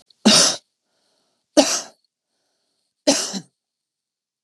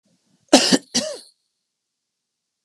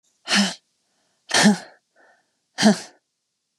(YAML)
three_cough_length: 4.4 s
three_cough_amplitude: 32768
three_cough_signal_mean_std_ratio: 0.31
cough_length: 2.6 s
cough_amplitude: 32768
cough_signal_mean_std_ratio: 0.27
exhalation_length: 3.6 s
exhalation_amplitude: 24840
exhalation_signal_mean_std_ratio: 0.34
survey_phase: beta (2021-08-13 to 2022-03-07)
age: 45-64
gender: Female
wearing_mask: 'No'
symptom_cough_any: true
symptom_new_continuous_cough: true
symptom_sore_throat: true
symptom_onset: 4 days
smoker_status: Never smoked
respiratory_condition_asthma: false
respiratory_condition_other: false
recruitment_source: Test and Trace
submission_delay: 1 day
covid_test_result: Negative
covid_test_method: RT-qPCR